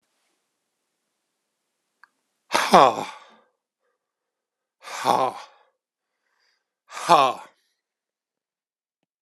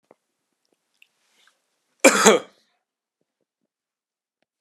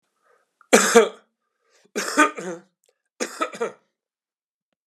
{"exhalation_length": "9.2 s", "exhalation_amplitude": 32768, "exhalation_signal_mean_std_ratio": 0.23, "cough_length": "4.6 s", "cough_amplitude": 32768, "cough_signal_mean_std_ratio": 0.2, "three_cough_length": "4.9 s", "three_cough_amplitude": 32767, "three_cough_signal_mean_std_ratio": 0.3, "survey_phase": "beta (2021-08-13 to 2022-03-07)", "age": "65+", "gender": "Male", "wearing_mask": "No", "symptom_runny_or_blocked_nose": true, "smoker_status": "Ex-smoker", "respiratory_condition_asthma": false, "respiratory_condition_other": false, "recruitment_source": "Test and Trace", "submission_delay": "1 day", "covid_test_result": "Positive", "covid_test_method": "RT-qPCR", "covid_ct_value": 15.2, "covid_ct_gene": "ORF1ab gene", "covid_ct_mean": 16.7, "covid_viral_load": "3200000 copies/ml", "covid_viral_load_category": "High viral load (>1M copies/ml)"}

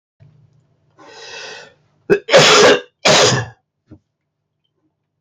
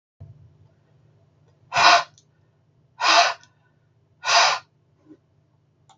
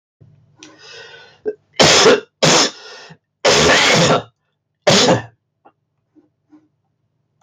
{"cough_length": "5.2 s", "cough_amplitude": 32681, "cough_signal_mean_std_ratio": 0.39, "exhalation_length": "6.0 s", "exhalation_amplitude": 29893, "exhalation_signal_mean_std_ratio": 0.32, "three_cough_length": "7.4 s", "three_cough_amplitude": 32766, "three_cough_signal_mean_std_ratio": 0.45, "survey_phase": "beta (2021-08-13 to 2022-03-07)", "age": "45-64", "gender": "Male", "wearing_mask": "No", "symptom_cough_any": true, "smoker_status": "Never smoked", "respiratory_condition_asthma": false, "respiratory_condition_other": false, "recruitment_source": "Test and Trace", "submission_delay": "1 day", "covid_test_result": "Positive", "covid_test_method": "RT-qPCR", "covid_ct_value": 26.6, "covid_ct_gene": "N gene"}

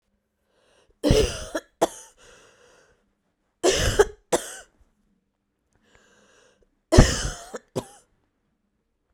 {"three_cough_length": "9.1 s", "three_cough_amplitude": 32767, "three_cough_signal_mean_std_ratio": 0.28, "survey_phase": "beta (2021-08-13 to 2022-03-07)", "age": "18-44", "gender": "Female", "wearing_mask": "No", "symptom_cough_any": true, "symptom_runny_or_blocked_nose": true, "symptom_shortness_of_breath": true, "symptom_sore_throat": true, "symptom_abdominal_pain": true, "symptom_fatigue": true, "symptom_fever_high_temperature": true, "symptom_headache": true, "symptom_change_to_sense_of_smell_or_taste": true, "symptom_loss_of_taste": true, "symptom_other": true, "symptom_onset": "3 days", "smoker_status": "Never smoked", "respiratory_condition_asthma": false, "respiratory_condition_other": false, "recruitment_source": "Test and Trace", "submission_delay": "2 days", "covid_test_result": "Positive", "covid_test_method": "RT-qPCR", "covid_ct_value": 15.1, "covid_ct_gene": "ORF1ab gene", "covid_ct_mean": 15.3, "covid_viral_load": "9800000 copies/ml", "covid_viral_load_category": "High viral load (>1M copies/ml)"}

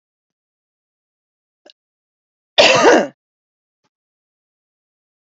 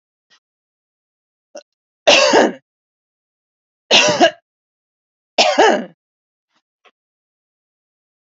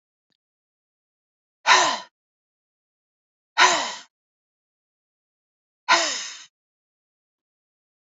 {"cough_length": "5.2 s", "cough_amplitude": 29632, "cough_signal_mean_std_ratio": 0.24, "three_cough_length": "8.3 s", "three_cough_amplitude": 31743, "three_cough_signal_mean_std_ratio": 0.31, "exhalation_length": "8.0 s", "exhalation_amplitude": 27982, "exhalation_signal_mean_std_ratio": 0.26, "survey_phase": "beta (2021-08-13 to 2022-03-07)", "age": "45-64", "gender": "Female", "wearing_mask": "No", "symptom_abdominal_pain": true, "symptom_headache": true, "smoker_status": "Ex-smoker", "respiratory_condition_asthma": false, "respiratory_condition_other": false, "recruitment_source": "Test and Trace", "submission_delay": "1 day", "covid_test_result": "Negative", "covid_test_method": "RT-qPCR"}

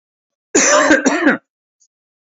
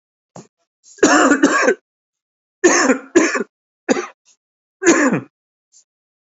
{"cough_length": "2.2 s", "cough_amplitude": 28821, "cough_signal_mean_std_ratio": 0.5, "three_cough_length": "6.2 s", "three_cough_amplitude": 30345, "three_cough_signal_mean_std_ratio": 0.44, "survey_phase": "alpha (2021-03-01 to 2021-08-12)", "age": "45-64", "gender": "Male", "wearing_mask": "No", "symptom_cough_any": true, "symptom_fatigue": true, "symptom_change_to_sense_of_smell_or_taste": true, "symptom_onset": "5 days", "smoker_status": "Never smoked", "respiratory_condition_asthma": false, "respiratory_condition_other": false, "recruitment_source": "Test and Trace", "submission_delay": "2 days", "covid_test_result": "Positive", "covid_test_method": "RT-qPCR", "covid_ct_value": 15.7, "covid_ct_gene": "N gene", "covid_ct_mean": 15.7, "covid_viral_load": "6900000 copies/ml", "covid_viral_load_category": "High viral load (>1M copies/ml)"}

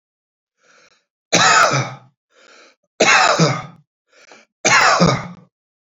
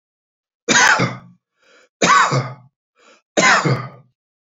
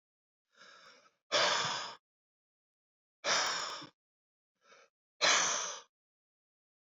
{"cough_length": "5.8 s", "cough_amplitude": 32767, "cough_signal_mean_std_ratio": 0.46, "three_cough_length": "4.5 s", "three_cough_amplitude": 30421, "three_cough_signal_mean_std_ratio": 0.45, "exhalation_length": "7.0 s", "exhalation_amplitude": 5665, "exhalation_signal_mean_std_ratio": 0.38, "survey_phase": "beta (2021-08-13 to 2022-03-07)", "age": "45-64", "gender": "Male", "wearing_mask": "No", "symptom_none": true, "smoker_status": "Ex-smoker", "respiratory_condition_asthma": false, "respiratory_condition_other": false, "recruitment_source": "REACT", "submission_delay": "6 days", "covid_test_result": "Negative", "covid_test_method": "RT-qPCR"}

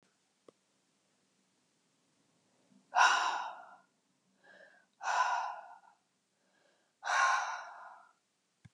{"exhalation_length": "8.7 s", "exhalation_amplitude": 7848, "exhalation_signal_mean_std_ratio": 0.35, "survey_phase": "beta (2021-08-13 to 2022-03-07)", "age": "65+", "gender": "Female", "wearing_mask": "No", "symptom_cough_any": true, "smoker_status": "Never smoked", "respiratory_condition_asthma": false, "respiratory_condition_other": false, "recruitment_source": "REACT", "submission_delay": "1 day", "covid_test_result": "Negative", "covid_test_method": "RT-qPCR"}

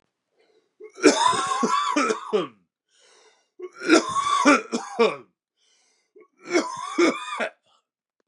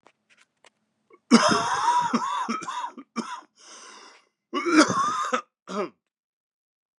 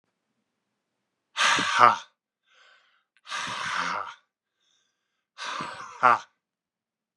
{"three_cough_length": "8.3 s", "three_cough_amplitude": 26936, "three_cough_signal_mean_std_ratio": 0.48, "cough_length": "7.0 s", "cough_amplitude": 24819, "cough_signal_mean_std_ratio": 0.46, "exhalation_length": "7.2 s", "exhalation_amplitude": 28856, "exhalation_signal_mean_std_ratio": 0.32, "survey_phase": "beta (2021-08-13 to 2022-03-07)", "age": "45-64", "gender": "Male", "wearing_mask": "No", "symptom_cough_any": true, "symptom_new_continuous_cough": true, "symptom_runny_or_blocked_nose": true, "symptom_sore_throat": true, "symptom_change_to_sense_of_smell_or_taste": true, "symptom_onset": "3 days", "smoker_status": "Ex-smoker", "respiratory_condition_asthma": false, "respiratory_condition_other": false, "recruitment_source": "Test and Trace", "submission_delay": "2 days", "covid_test_result": "Positive", "covid_test_method": "RT-qPCR", "covid_ct_value": 19.0, "covid_ct_gene": "ORF1ab gene", "covid_ct_mean": 20.0, "covid_viral_load": "270000 copies/ml", "covid_viral_load_category": "Low viral load (10K-1M copies/ml)"}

